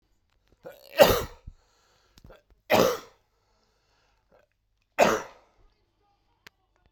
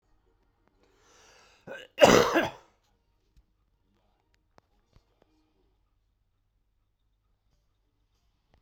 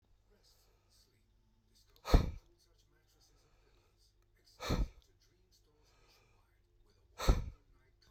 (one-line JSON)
{"three_cough_length": "6.9 s", "three_cough_amplitude": 27386, "three_cough_signal_mean_std_ratio": 0.25, "cough_length": "8.6 s", "cough_amplitude": 21007, "cough_signal_mean_std_ratio": 0.18, "exhalation_length": "8.1 s", "exhalation_amplitude": 7045, "exhalation_signal_mean_std_ratio": 0.21, "survey_phase": "beta (2021-08-13 to 2022-03-07)", "age": "45-64", "gender": "Male", "wearing_mask": "No", "symptom_cough_any": true, "symptom_runny_or_blocked_nose": true, "symptom_headache": true, "symptom_change_to_sense_of_smell_or_taste": true, "symptom_onset": "4 days", "smoker_status": "Never smoked", "respiratory_condition_asthma": false, "respiratory_condition_other": false, "recruitment_source": "Test and Trace", "submission_delay": "2 days", "covid_test_result": "Positive", "covid_test_method": "RT-qPCR", "covid_ct_value": 17.2, "covid_ct_gene": "ORF1ab gene", "covid_ct_mean": 18.3, "covid_viral_load": "1000000 copies/ml", "covid_viral_load_category": "High viral load (>1M copies/ml)"}